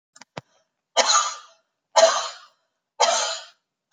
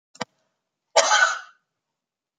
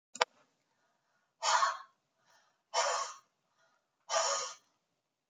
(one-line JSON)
{"three_cough_length": "3.9 s", "three_cough_amplitude": 25765, "three_cough_signal_mean_std_ratio": 0.39, "cough_length": "2.4 s", "cough_amplitude": 30662, "cough_signal_mean_std_ratio": 0.32, "exhalation_length": "5.3 s", "exhalation_amplitude": 21273, "exhalation_signal_mean_std_ratio": 0.36, "survey_phase": "beta (2021-08-13 to 2022-03-07)", "age": "65+", "gender": "Female", "wearing_mask": "No", "symptom_none": true, "smoker_status": "Never smoked", "respiratory_condition_asthma": false, "respiratory_condition_other": false, "recruitment_source": "REACT", "submission_delay": "3 days", "covid_test_result": "Negative", "covid_test_method": "RT-qPCR"}